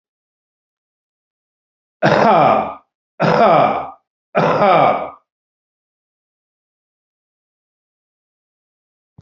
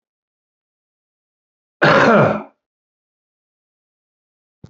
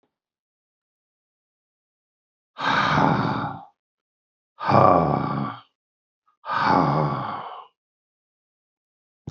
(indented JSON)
{
  "three_cough_length": "9.2 s",
  "three_cough_amplitude": 32767,
  "three_cough_signal_mean_std_ratio": 0.38,
  "cough_length": "4.7 s",
  "cough_amplitude": 32767,
  "cough_signal_mean_std_ratio": 0.28,
  "exhalation_length": "9.3 s",
  "exhalation_amplitude": 27252,
  "exhalation_signal_mean_std_ratio": 0.42,
  "survey_phase": "beta (2021-08-13 to 2022-03-07)",
  "age": "65+",
  "gender": "Male",
  "wearing_mask": "No",
  "symptom_cough_any": true,
  "symptom_runny_or_blocked_nose": true,
  "symptom_sore_throat": true,
  "symptom_onset": "3 days",
  "smoker_status": "Current smoker (11 or more cigarettes per day)",
  "respiratory_condition_asthma": false,
  "respiratory_condition_other": false,
  "recruitment_source": "Test and Trace",
  "submission_delay": "2 days",
  "covid_test_result": "Positive",
  "covid_test_method": "ePCR"
}